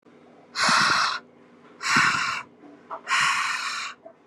{"exhalation_length": "4.3 s", "exhalation_amplitude": 14538, "exhalation_signal_mean_std_ratio": 0.62, "survey_phase": "beta (2021-08-13 to 2022-03-07)", "age": "18-44", "gender": "Female", "wearing_mask": "No", "symptom_none": true, "smoker_status": "Current smoker (1 to 10 cigarettes per day)", "respiratory_condition_asthma": false, "respiratory_condition_other": false, "recruitment_source": "REACT", "submission_delay": "1 day", "covid_test_result": "Negative", "covid_test_method": "RT-qPCR"}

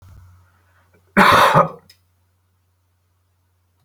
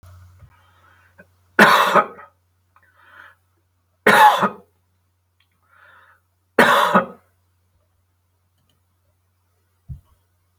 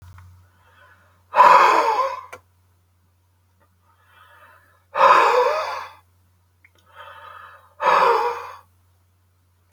{"cough_length": "3.8 s", "cough_amplitude": 30164, "cough_signal_mean_std_ratio": 0.31, "three_cough_length": "10.6 s", "three_cough_amplitude": 32768, "three_cough_signal_mean_std_ratio": 0.29, "exhalation_length": "9.7 s", "exhalation_amplitude": 27775, "exhalation_signal_mean_std_ratio": 0.38, "survey_phase": "beta (2021-08-13 to 2022-03-07)", "age": "65+", "gender": "Male", "wearing_mask": "No", "symptom_none": true, "smoker_status": "Never smoked", "respiratory_condition_asthma": false, "respiratory_condition_other": false, "recruitment_source": "REACT", "submission_delay": "1 day", "covid_test_result": "Negative", "covid_test_method": "RT-qPCR"}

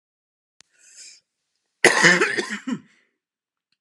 {"cough_length": "3.8 s", "cough_amplitude": 32768, "cough_signal_mean_std_ratio": 0.32, "survey_phase": "alpha (2021-03-01 to 2021-08-12)", "age": "45-64", "gender": "Male", "wearing_mask": "No", "symptom_cough_any": true, "symptom_fatigue": true, "symptom_onset": "2 days", "smoker_status": "Never smoked", "respiratory_condition_asthma": true, "respiratory_condition_other": false, "recruitment_source": "Test and Trace", "submission_delay": "1 day", "covid_test_result": "Positive", "covid_test_method": "RT-qPCR"}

